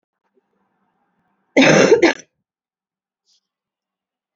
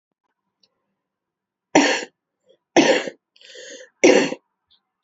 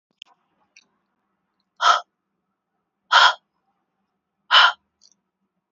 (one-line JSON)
{"cough_length": "4.4 s", "cough_amplitude": 29712, "cough_signal_mean_std_ratio": 0.29, "three_cough_length": "5.0 s", "three_cough_amplitude": 29299, "three_cough_signal_mean_std_ratio": 0.32, "exhalation_length": "5.7 s", "exhalation_amplitude": 28939, "exhalation_signal_mean_std_ratio": 0.25, "survey_phase": "beta (2021-08-13 to 2022-03-07)", "age": "18-44", "gender": "Female", "wearing_mask": "No", "symptom_cough_any": true, "symptom_runny_or_blocked_nose": true, "symptom_sore_throat": true, "symptom_fatigue": true, "symptom_headache": true, "symptom_onset": "6 days", "smoker_status": "Never smoked", "respiratory_condition_asthma": false, "respiratory_condition_other": false, "recruitment_source": "Test and Trace", "submission_delay": "2 days", "covid_test_result": "Positive", "covid_test_method": "RT-qPCR", "covid_ct_value": 16.6, "covid_ct_gene": "N gene"}